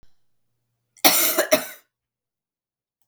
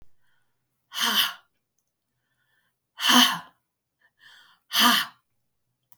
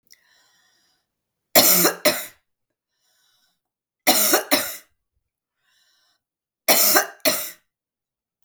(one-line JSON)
{"cough_length": "3.1 s", "cough_amplitude": 32768, "cough_signal_mean_std_ratio": 0.31, "exhalation_length": "6.0 s", "exhalation_amplitude": 21641, "exhalation_signal_mean_std_ratio": 0.32, "three_cough_length": "8.4 s", "three_cough_amplitude": 32768, "three_cough_signal_mean_std_ratio": 0.34, "survey_phase": "beta (2021-08-13 to 2022-03-07)", "age": "65+", "gender": "Female", "wearing_mask": "No", "symptom_cough_any": true, "symptom_new_continuous_cough": true, "symptom_runny_or_blocked_nose": true, "symptom_sore_throat": true, "symptom_fever_high_temperature": true, "symptom_onset": "2 days", "smoker_status": "Never smoked", "respiratory_condition_asthma": false, "respiratory_condition_other": false, "recruitment_source": "Test and Trace", "submission_delay": "1 day", "covid_test_result": "Positive", "covid_test_method": "ePCR"}